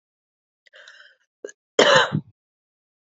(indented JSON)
{
  "cough_length": "3.2 s",
  "cough_amplitude": 28953,
  "cough_signal_mean_std_ratio": 0.27,
  "survey_phase": "beta (2021-08-13 to 2022-03-07)",
  "age": "45-64",
  "gender": "Female",
  "wearing_mask": "No",
  "symptom_cough_any": true,
  "symptom_runny_or_blocked_nose": true,
  "symptom_shortness_of_breath": true,
  "symptom_abdominal_pain": true,
  "symptom_fatigue": true,
  "symptom_onset": "3 days",
  "smoker_status": "Never smoked",
  "respiratory_condition_asthma": true,
  "respiratory_condition_other": false,
  "recruitment_source": "Test and Trace",
  "submission_delay": "2 days",
  "covid_test_result": "Positive",
  "covid_test_method": "RT-qPCR",
  "covid_ct_value": 24.6,
  "covid_ct_gene": "N gene",
  "covid_ct_mean": 24.7,
  "covid_viral_load": "7800 copies/ml",
  "covid_viral_load_category": "Minimal viral load (< 10K copies/ml)"
}